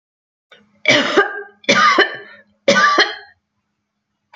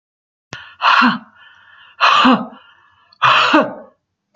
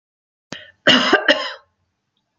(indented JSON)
{
  "three_cough_length": "4.4 s",
  "three_cough_amplitude": 32768,
  "three_cough_signal_mean_std_ratio": 0.46,
  "exhalation_length": "4.4 s",
  "exhalation_amplitude": 32521,
  "exhalation_signal_mean_std_ratio": 0.47,
  "cough_length": "2.4 s",
  "cough_amplitude": 30024,
  "cough_signal_mean_std_ratio": 0.37,
  "survey_phase": "beta (2021-08-13 to 2022-03-07)",
  "age": "65+",
  "gender": "Female",
  "wearing_mask": "No",
  "symptom_none": true,
  "smoker_status": "Never smoked",
  "respiratory_condition_asthma": false,
  "respiratory_condition_other": false,
  "recruitment_source": "REACT",
  "submission_delay": "1 day",
  "covid_test_result": "Negative",
  "covid_test_method": "RT-qPCR"
}